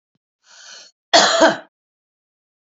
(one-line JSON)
{"cough_length": "2.7 s", "cough_amplitude": 29755, "cough_signal_mean_std_ratio": 0.32, "survey_phase": "beta (2021-08-13 to 2022-03-07)", "age": "45-64", "gender": "Female", "wearing_mask": "No", "symptom_cough_any": true, "symptom_new_continuous_cough": true, "symptom_fatigue": true, "symptom_headache": true, "symptom_change_to_sense_of_smell_or_taste": true, "smoker_status": "Ex-smoker", "respiratory_condition_asthma": false, "respiratory_condition_other": false, "recruitment_source": "Test and Trace", "submission_delay": "-1 day", "covid_test_result": "Positive", "covid_test_method": "LFT"}